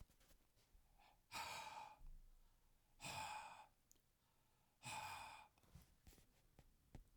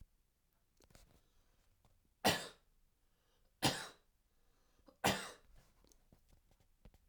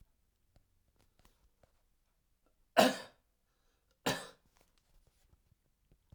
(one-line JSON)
{"exhalation_length": "7.2 s", "exhalation_amplitude": 441, "exhalation_signal_mean_std_ratio": 0.58, "three_cough_length": "7.1 s", "three_cough_amplitude": 4340, "three_cough_signal_mean_std_ratio": 0.24, "cough_length": "6.1 s", "cough_amplitude": 9945, "cough_signal_mean_std_ratio": 0.18, "survey_phase": "alpha (2021-03-01 to 2021-08-12)", "age": "65+", "gender": "Male", "wearing_mask": "No", "symptom_none": true, "smoker_status": "Ex-smoker", "respiratory_condition_asthma": false, "respiratory_condition_other": false, "recruitment_source": "REACT", "submission_delay": "1 day", "covid_test_result": "Negative", "covid_test_method": "RT-qPCR"}